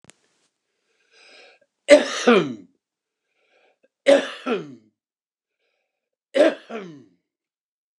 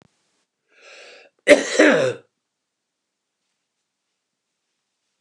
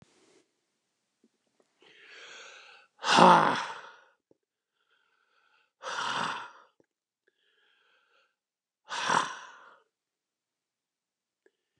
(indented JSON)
{
  "three_cough_length": "8.0 s",
  "three_cough_amplitude": 29204,
  "three_cough_signal_mean_std_ratio": 0.27,
  "cough_length": "5.2 s",
  "cough_amplitude": 29204,
  "cough_signal_mean_std_ratio": 0.25,
  "exhalation_length": "11.8 s",
  "exhalation_amplitude": 24264,
  "exhalation_signal_mean_std_ratio": 0.24,
  "survey_phase": "beta (2021-08-13 to 2022-03-07)",
  "age": "65+",
  "gender": "Male",
  "wearing_mask": "No",
  "symptom_none": true,
  "smoker_status": "Ex-smoker",
  "respiratory_condition_asthma": false,
  "respiratory_condition_other": false,
  "recruitment_source": "REACT",
  "submission_delay": "2 days",
  "covid_test_result": "Negative",
  "covid_test_method": "RT-qPCR",
  "influenza_a_test_result": "Negative",
  "influenza_b_test_result": "Negative"
}